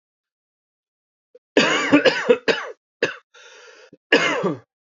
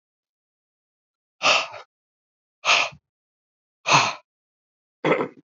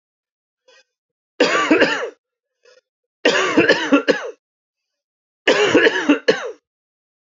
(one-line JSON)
{"cough_length": "4.9 s", "cough_amplitude": 29877, "cough_signal_mean_std_ratio": 0.41, "exhalation_length": "5.5 s", "exhalation_amplitude": 22004, "exhalation_signal_mean_std_ratio": 0.32, "three_cough_length": "7.3 s", "three_cough_amplitude": 28678, "three_cough_signal_mean_std_ratio": 0.45, "survey_phase": "beta (2021-08-13 to 2022-03-07)", "age": "45-64", "gender": "Male", "wearing_mask": "No", "symptom_cough_any": true, "symptom_new_continuous_cough": true, "symptom_runny_or_blocked_nose": true, "symptom_sore_throat": true, "symptom_fatigue": true, "symptom_fever_high_temperature": true, "symptom_headache": true, "smoker_status": "Ex-smoker", "respiratory_condition_asthma": false, "respiratory_condition_other": false, "recruitment_source": "Test and Trace", "submission_delay": "1 day", "covid_test_result": "Positive", "covid_test_method": "RT-qPCR", "covid_ct_value": 33.2, "covid_ct_gene": "N gene", "covid_ct_mean": 34.0, "covid_viral_load": "7.2 copies/ml", "covid_viral_load_category": "Minimal viral load (< 10K copies/ml)"}